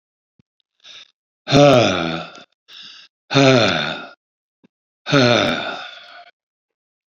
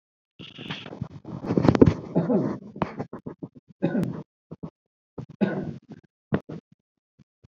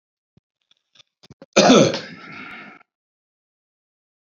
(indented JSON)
{
  "exhalation_length": "7.2 s",
  "exhalation_amplitude": 32768,
  "exhalation_signal_mean_std_ratio": 0.41,
  "three_cough_length": "7.6 s",
  "three_cough_amplitude": 27466,
  "three_cough_signal_mean_std_ratio": 0.37,
  "cough_length": "4.3 s",
  "cough_amplitude": 29157,
  "cough_signal_mean_std_ratio": 0.26,
  "survey_phase": "beta (2021-08-13 to 2022-03-07)",
  "age": "65+",
  "gender": "Male",
  "wearing_mask": "No",
  "symptom_runny_or_blocked_nose": true,
  "smoker_status": "Current smoker (11 or more cigarettes per day)",
  "respiratory_condition_asthma": false,
  "respiratory_condition_other": true,
  "recruitment_source": "REACT",
  "submission_delay": "1 day",
  "covid_test_result": "Negative",
  "covid_test_method": "RT-qPCR"
}